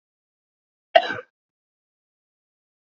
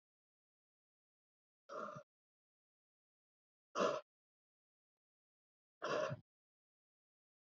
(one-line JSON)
{"cough_length": "2.8 s", "cough_amplitude": 27764, "cough_signal_mean_std_ratio": 0.15, "exhalation_length": "7.6 s", "exhalation_amplitude": 2383, "exhalation_signal_mean_std_ratio": 0.24, "survey_phase": "beta (2021-08-13 to 2022-03-07)", "age": "18-44", "gender": "Male", "wearing_mask": "No", "symptom_cough_any": true, "symptom_runny_or_blocked_nose": true, "symptom_shortness_of_breath": true, "symptom_fatigue": true, "symptom_headache": true, "symptom_change_to_sense_of_smell_or_taste": true, "symptom_onset": "6 days", "smoker_status": "Never smoked", "respiratory_condition_asthma": false, "respiratory_condition_other": false, "recruitment_source": "Test and Trace", "submission_delay": "2 days", "covid_test_result": "Positive", "covid_test_method": "RT-qPCR", "covid_ct_value": 16.6, "covid_ct_gene": "ORF1ab gene"}